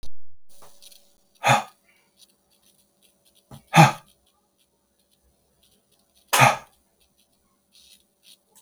exhalation_length: 8.6 s
exhalation_amplitude: 32330
exhalation_signal_mean_std_ratio: 0.26
survey_phase: beta (2021-08-13 to 2022-03-07)
age: 18-44
gender: Male
wearing_mask: 'No'
symptom_cough_any: true
smoker_status: Never smoked
respiratory_condition_asthma: false
respiratory_condition_other: false
recruitment_source: REACT
submission_delay: 1 day
covid_test_result: Negative
covid_test_method: RT-qPCR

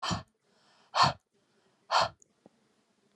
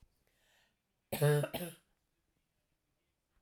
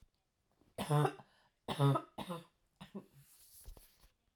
exhalation_length: 3.2 s
exhalation_amplitude: 9433
exhalation_signal_mean_std_ratio: 0.31
cough_length: 3.4 s
cough_amplitude: 3765
cough_signal_mean_std_ratio: 0.28
three_cough_length: 4.4 s
three_cough_amplitude: 3617
three_cough_signal_mean_std_ratio: 0.36
survey_phase: alpha (2021-03-01 to 2021-08-12)
age: 45-64
gender: Female
wearing_mask: 'No'
symptom_none: true
smoker_status: Never smoked
respiratory_condition_asthma: false
respiratory_condition_other: false
recruitment_source: REACT
submission_delay: 1 day
covid_test_result: Negative
covid_test_method: RT-qPCR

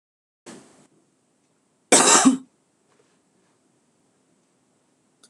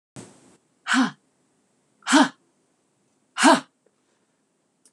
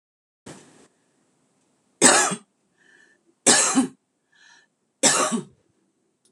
cough_length: 5.3 s
cough_amplitude: 26027
cough_signal_mean_std_ratio: 0.24
exhalation_length: 4.9 s
exhalation_amplitude: 24637
exhalation_signal_mean_std_ratio: 0.28
three_cough_length: 6.3 s
three_cough_amplitude: 26028
three_cough_signal_mean_std_ratio: 0.33
survey_phase: beta (2021-08-13 to 2022-03-07)
age: 45-64
gender: Female
wearing_mask: 'No'
symptom_cough_any: true
smoker_status: Ex-smoker
respiratory_condition_asthma: false
respiratory_condition_other: false
recruitment_source: REACT
submission_delay: 2 days
covid_test_result: Negative
covid_test_method: RT-qPCR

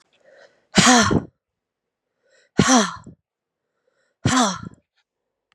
exhalation_length: 5.5 s
exhalation_amplitude: 30460
exhalation_signal_mean_std_ratio: 0.35
survey_phase: beta (2021-08-13 to 2022-03-07)
age: 18-44
gender: Female
wearing_mask: 'No'
symptom_cough_any: true
symptom_new_continuous_cough: true
symptom_runny_or_blocked_nose: true
symptom_shortness_of_breath: true
symptom_sore_throat: true
symptom_fatigue: true
symptom_headache: true
symptom_change_to_sense_of_smell_or_taste: true
symptom_other: true
symptom_onset: 3 days
smoker_status: Never smoked
respiratory_condition_asthma: false
respiratory_condition_other: false
recruitment_source: Test and Trace
submission_delay: 1 day
covid_test_result: Positive
covid_test_method: ePCR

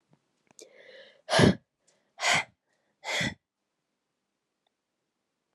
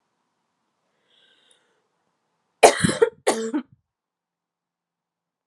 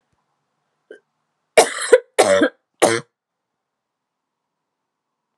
exhalation_length: 5.5 s
exhalation_amplitude: 15770
exhalation_signal_mean_std_ratio: 0.27
cough_length: 5.5 s
cough_amplitude: 32768
cough_signal_mean_std_ratio: 0.22
three_cough_length: 5.4 s
three_cough_amplitude: 32768
three_cough_signal_mean_std_ratio: 0.27
survey_phase: alpha (2021-03-01 to 2021-08-12)
age: 18-44
gender: Female
wearing_mask: 'No'
symptom_cough_any: true
symptom_fatigue: true
symptom_headache: true
symptom_change_to_sense_of_smell_or_taste: true
symptom_loss_of_taste: true
symptom_onset: 4 days
smoker_status: Never smoked
respiratory_condition_asthma: false
respiratory_condition_other: false
recruitment_source: Test and Trace
submission_delay: 2 days
covid_test_result: Positive
covid_test_method: RT-qPCR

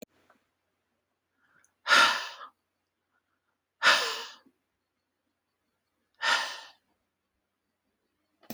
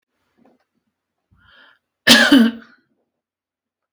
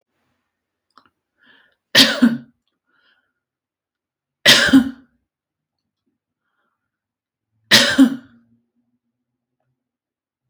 exhalation_length: 8.5 s
exhalation_amplitude: 12096
exhalation_signal_mean_std_ratio: 0.26
cough_length: 3.9 s
cough_amplitude: 32767
cough_signal_mean_std_ratio: 0.28
three_cough_length: 10.5 s
three_cough_amplitude: 32767
three_cough_signal_mean_std_ratio: 0.26
survey_phase: alpha (2021-03-01 to 2021-08-12)
age: 45-64
gender: Female
wearing_mask: 'No'
symptom_none: true
smoker_status: Never smoked
respiratory_condition_asthma: false
respiratory_condition_other: false
recruitment_source: REACT
submission_delay: 2 days
covid_test_result: Negative
covid_test_method: RT-qPCR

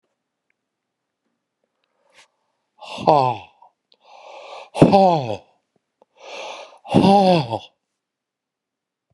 exhalation_length: 9.1 s
exhalation_amplitude: 32768
exhalation_signal_mean_std_ratio: 0.31
survey_phase: beta (2021-08-13 to 2022-03-07)
age: 65+
gender: Male
wearing_mask: 'No'
symptom_none: true
smoker_status: Ex-smoker
respiratory_condition_asthma: false
respiratory_condition_other: false
recruitment_source: REACT
submission_delay: 2 days
covid_test_result: Negative
covid_test_method: RT-qPCR
influenza_a_test_result: Negative
influenza_b_test_result: Negative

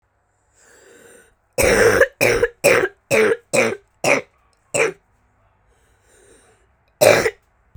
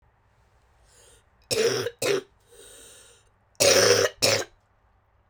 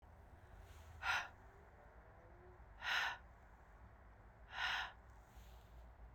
cough_length: 7.8 s
cough_amplitude: 32768
cough_signal_mean_std_ratio: 0.42
three_cough_length: 5.3 s
three_cough_amplitude: 18458
three_cough_signal_mean_std_ratio: 0.41
exhalation_length: 6.1 s
exhalation_amplitude: 1707
exhalation_signal_mean_std_ratio: 0.52
survey_phase: beta (2021-08-13 to 2022-03-07)
age: 18-44
gender: Female
wearing_mask: 'No'
symptom_cough_any: true
symptom_sore_throat: true
symptom_fatigue: true
symptom_headache: true
symptom_onset: 4 days
smoker_status: Never smoked
respiratory_condition_asthma: false
respiratory_condition_other: false
recruitment_source: Test and Trace
submission_delay: 2 days
covid_test_result: Positive
covid_test_method: RT-qPCR
covid_ct_value: 20.6
covid_ct_gene: N gene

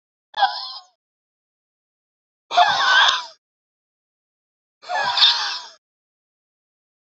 exhalation_length: 7.2 s
exhalation_amplitude: 30079
exhalation_signal_mean_std_ratio: 0.36
survey_phase: beta (2021-08-13 to 2022-03-07)
age: 18-44
gender: Male
wearing_mask: 'No'
symptom_cough_any: true
symptom_runny_or_blocked_nose: true
symptom_shortness_of_breath: true
symptom_sore_throat: true
symptom_fatigue: true
symptom_headache: true
symptom_other: true
symptom_onset: 4 days
smoker_status: Current smoker (e-cigarettes or vapes only)
respiratory_condition_asthma: false
respiratory_condition_other: false
recruitment_source: Test and Trace
submission_delay: 1 day
covid_test_result: Positive
covid_test_method: RT-qPCR
covid_ct_value: 20.2
covid_ct_gene: ORF1ab gene
covid_ct_mean: 20.3
covid_viral_load: 220000 copies/ml
covid_viral_load_category: Low viral load (10K-1M copies/ml)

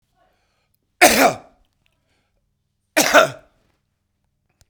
cough_length: 4.7 s
cough_amplitude: 32768
cough_signal_mean_std_ratio: 0.28
survey_phase: beta (2021-08-13 to 2022-03-07)
age: 65+
gender: Male
wearing_mask: 'No'
symptom_cough_any: true
symptom_sore_throat: true
symptom_fatigue: true
symptom_headache: true
smoker_status: Ex-smoker
respiratory_condition_asthma: false
respiratory_condition_other: false
recruitment_source: Test and Trace
submission_delay: 3 days
covid_test_result: Positive
covid_test_method: ePCR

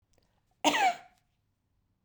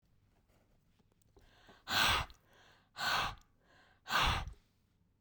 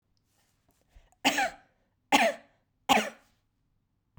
cough_length: 2.0 s
cough_amplitude: 12454
cough_signal_mean_std_ratio: 0.32
exhalation_length: 5.2 s
exhalation_amplitude: 4367
exhalation_signal_mean_std_ratio: 0.39
three_cough_length: 4.2 s
three_cough_amplitude: 17171
three_cough_signal_mean_std_ratio: 0.31
survey_phase: beta (2021-08-13 to 2022-03-07)
age: 45-64
gender: Female
wearing_mask: 'No'
symptom_fatigue: true
smoker_status: Current smoker (1 to 10 cigarettes per day)
respiratory_condition_asthma: false
respiratory_condition_other: false
recruitment_source: REACT
submission_delay: 3 days
covid_test_result: Negative
covid_test_method: RT-qPCR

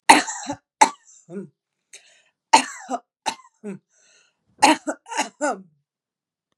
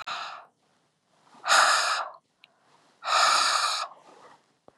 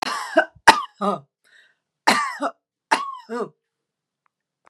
three_cough_length: 6.6 s
three_cough_amplitude: 32768
three_cough_signal_mean_std_ratio: 0.27
exhalation_length: 4.8 s
exhalation_amplitude: 13808
exhalation_signal_mean_std_ratio: 0.48
cough_length: 4.7 s
cough_amplitude: 32768
cough_signal_mean_std_ratio: 0.34
survey_phase: beta (2021-08-13 to 2022-03-07)
age: 45-64
gender: Female
wearing_mask: 'No'
symptom_none: true
smoker_status: Never smoked
respiratory_condition_asthma: false
respiratory_condition_other: false
recruitment_source: REACT
submission_delay: 2 days
covid_test_result: Negative
covid_test_method: RT-qPCR
influenza_a_test_result: Negative
influenza_b_test_result: Negative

